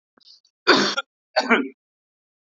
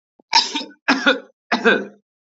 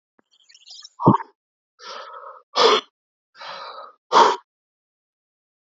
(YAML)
cough_length: 2.6 s
cough_amplitude: 28318
cough_signal_mean_std_ratio: 0.35
three_cough_length: 2.4 s
three_cough_amplitude: 32767
three_cough_signal_mean_std_ratio: 0.44
exhalation_length: 5.7 s
exhalation_amplitude: 27534
exhalation_signal_mean_std_ratio: 0.29
survey_phase: beta (2021-08-13 to 2022-03-07)
age: 45-64
gender: Male
wearing_mask: 'No'
symptom_none: true
symptom_onset: 12 days
smoker_status: Current smoker (11 or more cigarettes per day)
respiratory_condition_asthma: false
respiratory_condition_other: false
recruitment_source: REACT
submission_delay: 3 days
covid_test_result: Negative
covid_test_method: RT-qPCR
influenza_a_test_result: Negative
influenza_b_test_result: Negative